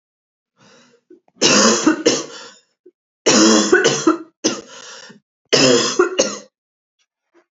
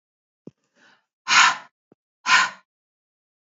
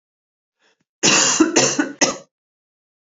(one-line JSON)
{"three_cough_length": "7.5 s", "three_cough_amplitude": 32768, "three_cough_signal_mean_std_ratio": 0.48, "exhalation_length": "3.5 s", "exhalation_amplitude": 28579, "exhalation_signal_mean_std_ratio": 0.29, "cough_length": "3.2 s", "cough_amplitude": 30750, "cough_signal_mean_std_ratio": 0.44, "survey_phase": "beta (2021-08-13 to 2022-03-07)", "age": "45-64", "gender": "Female", "wearing_mask": "No", "symptom_cough_any": true, "symptom_runny_or_blocked_nose": true, "symptom_sore_throat": true, "symptom_fatigue": true, "symptom_fever_high_temperature": true, "symptom_headache": true, "symptom_change_to_sense_of_smell_or_taste": true, "symptom_onset": "3 days", "smoker_status": "Never smoked", "respiratory_condition_asthma": false, "respiratory_condition_other": false, "recruitment_source": "Test and Trace", "submission_delay": "2 days", "covid_test_result": "Positive", "covid_test_method": "RT-qPCR", "covid_ct_value": 15.3, "covid_ct_gene": "ORF1ab gene", "covid_ct_mean": 15.7, "covid_viral_load": "7200000 copies/ml", "covid_viral_load_category": "High viral load (>1M copies/ml)"}